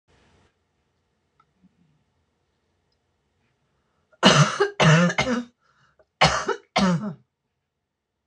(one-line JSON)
{"cough_length": "8.3 s", "cough_amplitude": 26028, "cough_signal_mean_std_ratio": 0.34, "survey_phase": "beta (2021-08-13 to 2022-03-07)", "age": "65+", "gender": "Female", "wearing_mask": "No", "symptom_cough_any": true, "smoker_status": "Ex-smoker", "respiratory_condition_asthma": false, "respiratory_condition_other": false, "recruitment_source": "REACT", "submission_delay": "4 days", "covid_test_result": "Negative", "covid_test_method": "RT-qPCR"}